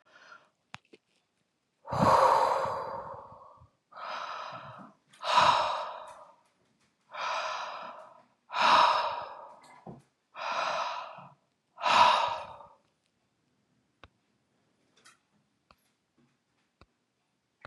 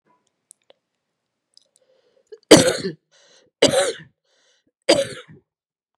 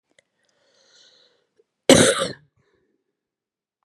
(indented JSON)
{
  "exhalation_length": "17.7 s",
  "exhalation_amplitude": 12351,
  "exhalation_signal_mean_std_ratio": 0.39,
  "three_cough_length": "6.0 s",
  "three_cough_amplitude": 32768,
  "three_cough_signal_mean_std_ratio": 0.25,
  "cough_length": "3.8 s",
  "cough_amplitude": 32768,
  "cough_signal_mean_std_ratio": 0.22,
  "survey_phase": "beta (2021-08-13 to 2022-03-07)",
  "age": "65+",
  "gender": "Female",
  "wearing_mask": "No",
  "symptom_cough_any": true,
  "symptom_runny_or_blocked_nose": true,
  "symptom_fatigue": true,
  "symptom_fever_high_temperature": true,
  "symptom_other": true,
  "symptom_onset": "5 days",
  "smoker_status": "Never smoked",
  "respiratory_condition_asthma": true,
  "respiratory_condition_other": false,
  "recruitment_source": "Test and Trace",
  "submission_delay": "2 days",
  "covid_test_result": "Positive",
  "covid_test_method": "RT-qPCR",
  "covid_ct_value": 15.7,
  "covid_ct_gene": "ORF1ab gene",
  "covid_ct_mean": 15.9,
  "covid_viral_load": "6100000 copies/ml",
  "covid_viral_load_category": "High viral load (>1M copies/ml)"
}